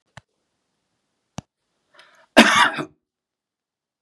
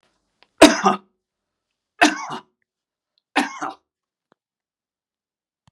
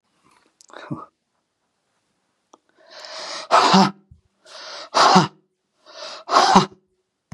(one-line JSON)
{"cough_length": "4.0 s", "cough_amplitude": 32768, "cough_signal_mean_std_ratio": 0.23, "three_cough_length": "5.7 s", "three_cough_amplitude": 32768, "three_cough_signal_mean_std_ratio": 0.22, "exhalation_length": "7.3 s", "exhalation_amplitude": 32767, "exhalation_signal_mean_std_ratio": 0.34, "survey_phase": "beta (2021-08-13 to 2022-03-07)", "age": "65+", "gender": "Male", "wearing_mask": "No", "symptom_none": true, "smoker_status": "Never smoked", "respiratory_condition_asthma": false, "respiratory_condition_other": false, "recruitment_source": "REACT", "submission_delay": "4 days", "covid_test_result": "Negative", "covid_test_method": "RT-qPCR", "influenza_a_test_result": "Negative", "influenza_b_test_result": "Negative"}